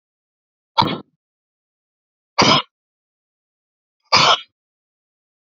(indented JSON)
{
  "exhalation_length": "5.5 s",
  "exhalation_amplitude": 32767,
  "exhalation_signal_mean_std_ratio": 0.26,
  "survey_phase": "beta (2021-08-13 to 2022-03-07)",
  "age": "45-64",
  "gender": "Male",
  "wearing_mask": "No",
  "symptom_cough_any": true,
  "symptom_runny_or_blocked_nose": true,
  "symptom_shortness_of_breath": true,
  "symptom_sore_throat": true,
  "symptom_abdominal_pain": true,
  "symptom_diarrhoea": true,
  "symptom_fatigue": true,
  "symptom_headache": true,
  "symptom_change_to_sense_of_smell_or_taste": true,
  "smoker_status": "Never smoked",
  "respiratory_condition_asthma": false,
  "respiratory_condition_other": false,
  "recruitment_source": "Test and Trace",
  "submission_delay": "2 days",
  "covid_test_result": "Positive",
  "covid_test_method": "RT-qPCR"
}